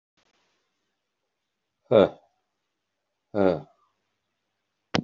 {
  "exhalation_length": "5.0 s",
  "exhalation_amplitude": 18737,
  "exhalation_signal_mean_std_ratio": 0.21,
  "survey_phase": "beta (2021-08-13 to 2022-03-07)",
  "age": "65+",
  "gender": "Male",
  "wearing_mask": "No",
  "symptom_cough_any": true,
  "symptom_onset": "2 days",
  "smoker_status": "Never smoked",
  "respiratory_condition_asthma": false,
  "respiratory_condition_other": false,
  "recruitment_source": "Test and Trace",
  "submission_delay": "2 days",
  "covid_test_result": "Positive",
  "covid_test_method": "RT-qPCR",
  "covid_ct_value": 22.7,
  "covid_ct_gene": "ORF1ab gene",
  "covid_ct_mean": 23.1,
  "covid_viral_load": "26000 copies/ml",
  "covid_viral_load_category": "Low viral load (10K-1M copies/ml)"
}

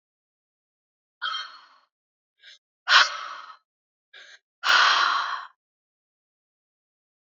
{
  "exhalation_length": "7.3 s",
  "exhalation_amplitude": 25960,
  "exhalation_signal_mean_std_ratio": 0.31,
  "survey_phase": "beta (2021-08-13 to 2022-03-07)",
  "age": "18-44",
  "gender": "Female",
  "wearing_mask": "No",
  "symptom_runny_or_blocked_nose": true,
  "smoker_status": "Never smoked",
  "respiratory_condition_asthma": false,
  "respiratory_condition_other": false,
  "recruitment_source": "REACT",
  "submission_delay": "2 days",
  "covid_test_result": "Negative",
  "covid_test_method": "RT-qPCR",
  "influenza_a_test_result": "Negative",
  "influenza_b_test_result": "Negative"
}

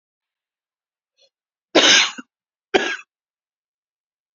{
  "cough_length": "4.4 s",
  "cough_amplitude": 32768,
  "cough_signal_mean_std_ratio": 0.26,
  "survey_phase": "beta (2021-08-13 to 2022-03-07)",
  "age": "65+",
  "gender": "Female",
  "wearing_mask": "No",
  "symptom_cough_any": true,
  "symptom_runny_or_blocked_nose": true,
  "symptom_fatigue": true,
  "symptom_fever_high_temperature": true,
  "symptom_headache": true,
  "symptom_other": true,
  "smoker_status": "Never smoked",
  "respiratory_condition_asthma": false,
  "respiratory_condition_other": false,
  "recruitment_source": "Test and Trace",
  "submission_delay": "2 days",
  "covid_test_result": "Positive",
  "covid_test_method": "RT-qPCR",
  "covid_ct_value": 20.6,
  "covid_ct_gene": "ORF1ab gene"
}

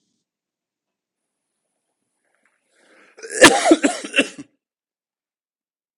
{
  "cough_length": "6.0 s",
  "cough_amplitude": 32768,
  "cough_signal_mean_std_ratio": 0.23,
  "survey_phase": "beta (2021-08-13 to 2022-03-07)",
  "age": "45-64",
  "gender": "Male",
  "wearing_mask": "No",
  "symptom_cough_any": true,
  "symptom_runny_or_blocked_nose": true,
  "symptom_sore_throat": true,
  "symptom_fatigue": true,
  "symptom_fever_high_temperature": true,
  "symptom_headache": true,
  "smoker_status": "Ex-smoker",
  "respiratory_condition_asthma": false,
  "respiratory_condition_other": false,
  "recruitment_source": "Test and Trace",
  "submission_delay": "3 days",
  "covid_test_result": "Negative",
  "covid_test_method": "RT-qPCR"
}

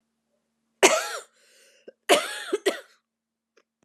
{
  "cough_length": "3.8 s",
  "cough_amplitude": 29981,
  "cough_signal_mean_std_ratio": 0.3,
  "survey_phase": "beta (2021-08-13 to 2022-03-07)",
  "age": "18-44",
  "gender": "Female",
  "wearing_mask": "No",
  "symptom_cough_any": true,
  "symptom_runny_or_blocked_nose": true,
  "symptom_shortness_of_breath": true,
  "symptom_sore_throat": true,
  "symptom_abdominal_pain": true,
  "symptom_fatigue": true,
  "symptom_fever_high_temperature": true,
  "symptom_headache": true,
  "smoker_status": "Never smoked",
  "respiratory_condition_asthma": false,
  "respiratory_condition_other": false,
  "recruitment_source": "Test and Trace",
  "submission_delay": "2 days",
  "covid_test_result": "Positive",
  "covid_test_method": "RT-qPCR",
  "covid_ct_value": 37.1,
  "covid_ct_gene": "ORF1ab gene"
}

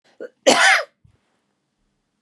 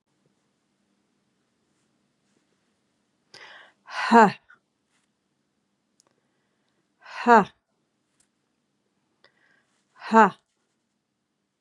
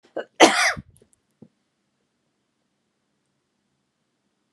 {
  "three_cough_length": "2.2 s",
  "three_cough_amplitude": 29600,
  "three_cough_signal_mean_std_ratio": 0.33,
  "exhalation_length": "11.6 s",
  "exhalation_amplitude": 28238,
  "exhalation_signal_mean_std_ratio": 0.18,
  "cough_length": "4.5 s",
  "cough_amplitude": 32507,
  "cough_signal_mean_std_ratio": 0.2,
  "survey_phase": "beta (2021-08-13 to 2022-03-07)",
  "age": "45-64",
  "gender": "Female",
  "wearing_mask": "No",
  "symptom_cough_any": true,
  "symptom_runny_or_blocked_nose": true,
  "symptom_sore_throat": true,
  "symptom_onset": "3 days",
  "smoker_status": "Never smoked",
  "respiratory_condition_asthma": false,
  "respiratory_condition_other": false,
  "recruitment_source": "Test and Trace",
  "submission_delay": "1 day",
  "covid_test_result": "Positive",
  "covid_test_method": "ePCR"
}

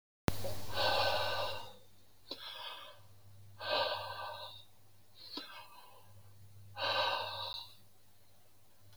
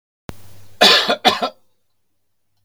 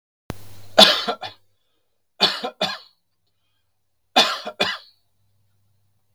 {
  "exhalation_length": "9.0 s",
  "exhalation_amplitude": 8031,
  "exhalation_signal_mean_std_ratio": 0.62,
  "cough_length": "2.6 s",
  "cough_amplitude": 32768,
  "cough_signal_mean_std_ratio": 0.37,
  "three_cough_length": "6.1 s",
  "three_cough_amplitude": 32767,
  "three_cough_signal_mean_std_ratio": 0.3,
  "survey_phase": "beta (2021-08-13 to 2022-03-07)",
  "age": "65+",
  "gender": "Male",
  "wearing_mask": "No",
  "symptom_none": true,
  "smoker_status": "Never smoked",
  "respiratory_condition_asthma": false,
  "respiratory_condition_other": false,
  "recruitment_source": "REACT",
  "submission_delay": "2 days",
  "covid_test_result": "Negative",
  "covid_test_method": "RT-qPCR"
}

